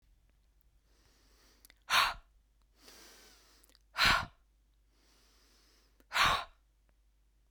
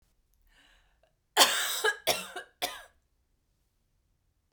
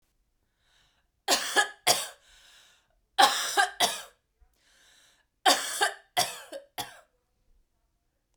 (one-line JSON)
{"exhalation_length": "7.5 s", "exhalation_amplitude": 6829, "exhalation_signal_mean_std_ratio": 0.28, "cough_length": "4.5 s", "cough_amplitude": 21351, "cough_signal_mean_std_ratio": 0.31, "three_cough_length": "8.4 s", "three_cough_amplitude": 23808, "three_cough_signal_mean_std_ratio": 0.34, "survey_phase": "beta (2021-08-13 to 2022-03-07)", "age": "18-44", "gender": "Female", "wearing_mask": "No", "symptom_none": true, "symptom_onset": "7 days", "smoker_status": "Never smoked", "respiratory_condition_asthma": false, "respiratory_condition_other": false, "recruitment_source": "Test and Trace", "submission_delay": "2 days", "covid_test_result": "Positive", "covid_test_method": "RT-qPCR", "covid_ct_value": 18.5, "covid_ct_gene": "ORF1ab gene", "covid_ct_mean": 19.3, "covid_viral_load": "460000 copies/ml", "covid_viral_load_category": "Low viral load (10K-1M copies/ml)"}